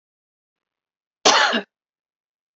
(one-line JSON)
{"cough_length": "2.6 s", "cough_amplitude": 31507, "cough_signal_mean_std_ratio": 0.29, "survey_phase": "beta (2021-08-13 to 2022-03-07)", "age": "45-64", "gender": "Female", "wearing_mask": "No", "symptom_headache": true, "smoker_status": "Ex-smoker", "respiratory_condition_asthma": false, "respiratory_condition_other": false, "recruitment_source": "REACT", "submission_delay": "1 day", "covid_test_result": "Negative", "covid_test_method": "RT-qPCR"}